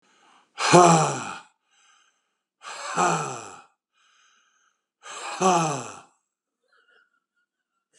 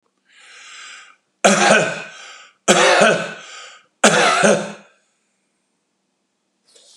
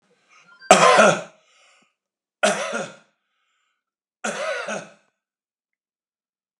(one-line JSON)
{"exhalation_length": "8.0 s", "exhalation_amplitude": 30522, "exhalation_signal_mean_std_ratio": 0.33, "three_cough_length": "7.0 s", "three_cough_amplitude": 32768, "three_cough_signal_mean_std_ratio": 0.43, "cough_length": "6.6 s", "cough_amplitude": 32768, "cough_signal_mean_std_ratio": 0.3, "survey_phase": "alpha (2021-03-01 to 2021-08-12)", "age": "65+", "gender": "Male", "wearing_mask": "No", "symptom_none": true, "smoker_status": "Ex-smoker", "respiratory_condition_asthma": false, "respiratory_condition_other": false, "recruitment_source": "REACT", "submission_delay": "2 days", "covid_test_result": "Negative", "covid_test_method": "RT-qPCR"}